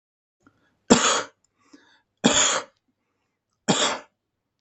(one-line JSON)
{"three_cough_length": "4.6 s", "three_cough_amplitude": 32766, "three_cough_signal_mean_std_ratio": 0.35, "survey_phase": "beta (2021-08-13 to 2022-03-07)", "age": "45-64", "gender": "Male", "wearing_mask": "No", "symptom_none": true, "smoker_status": "Never smoked", "respiratory_condition_asthma": false, "respiratory_condition_other": false, "recruitment_source": "REACT", "submission_delay": "2 days", "covid_test_result": "Negative", "covid_test_method": "RT-qPCR", "influenza_a_test_result": "Negative", "influenza_b_test_result": "Negative"}